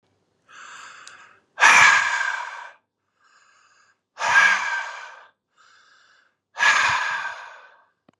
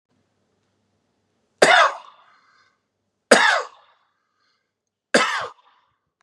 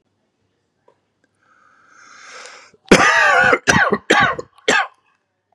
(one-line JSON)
{"exhalation_length": "8.2 s", "exhalation_amplitude": 31148, "exhalation_signal_mean_std_ratio": 0.41, "three_cough_length": "6.2 s", "three_cough_amplitude": 32768, "three_cough_signal_mean_std_ratio": 0.28, "cough_length": "5.5 s", "cough_amplitude": 32768, "cough_signal_mean_std_ratio": 0.42, "survey_phase": "beta (2021-08-13 to 2022-03-07)", "age": "18-44", "gender": "Male", "wearing_mask": "No", "symptom_none": true, "smoker_status": "Ex-smoker", "respiratory_condition_asthma": false, "respiratory_condition_other": false, "recruitment_source": "Test and Trace", "submission_delay": "2 days", "covid_test_result": "Positive", "covid_test_method": "RT-qPCR"}